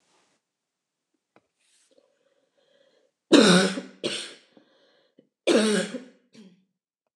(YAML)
cough_length: 7.2 s
cough_amplitude: 24038
cough_signal_mean_std_ratio: 0.29
survey_phase: beta (2021-08-13 to 2022-03-07)
age: 45-64
gender: Female
wearing_mask: 'No'
symptom_none: true
smoker_status: Never smoked
respiratory_condition_asthma: false
respiratory_condition_other: false
recruitment_source: REACT
submission_delay: 1 day
covid_test_result: Negative
covid_test_method: RT-qPCR
influenza_a_test_result: Negative
influenza_b_test_result: Negative